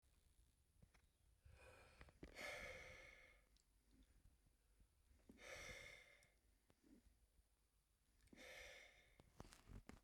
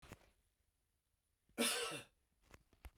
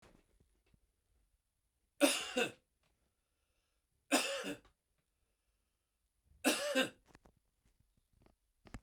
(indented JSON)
{
  "exhalation_length": "10.0 s",
  "exhalation_amplitude": 292,
  "exhalation_signal_mean_std_ratio": 0.59,
  "cough_length": "3.0 s",
  "cough_amplitude": 2000,
  "cough_signal_mean_std_ratio": 0.32,
  "three_cough_length": "8.8 s",
  "three_cough_amplitude": 6618,
  "three_cough_signal_mean_std_ratio": 0.28,
  "survey_phase": "beta (2021-08-13 to 2022-03-07)",
  "age": "45-64",
  "gender": "Male",
  "wearing_mask": "No",
  "symptom_none": true,
  "smoker_status": "Never smoked",
  "respiratory_condition_asthma": false,
  "respiratory_condition_other": false,
  "recruitment_source": "Test and Trace",
  "submission_delay": "-1 day",
  "covid_test_result": "Negative",
  "covid_test_method": "LFT"
}